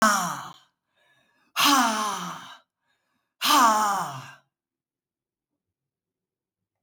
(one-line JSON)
{"exhalation_length": "6.8 s", "exhalation_amplitude": 14844, "exhalation_signal_mean_std_ratio": 0.41, "survey_phase": "beta (2021-08-13 to 2022-03-07)", "age": "65+", "gender": "Female", "wearing_mask": "No", "symptom_other": true, "symptom_onset": "12 days", "smoker_status": "Never smoked", "respiratory_condition_asthma": false, "respiratory_condition_other": false, "recruitment_source": "REACT", "submission_delay": "3 days", "covid_test_result": "Negative", "covid_test_method": "RT-qPCR"}